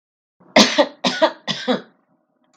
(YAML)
three_cough_length: 2.6 s
three_cough_amplitude: 32768
three_cough_signal_mean_std_ratio: 0.39
survey_phase: beta (2021-08-13 to 2022-03-07)
age: 65+
gender: Female
wearing_mask: 'No'
symptom_none: true
smoker_status: Never smoked
respiratory_condition_asthma: false
respiratory_condition_other: false
recruitment_source: REACT
submission_delay: 3 days
covid_test_result: Negative
covid_test_method: RT-qPCR
influenza_a_test_result: Negative
influenza_b_test_result: Negative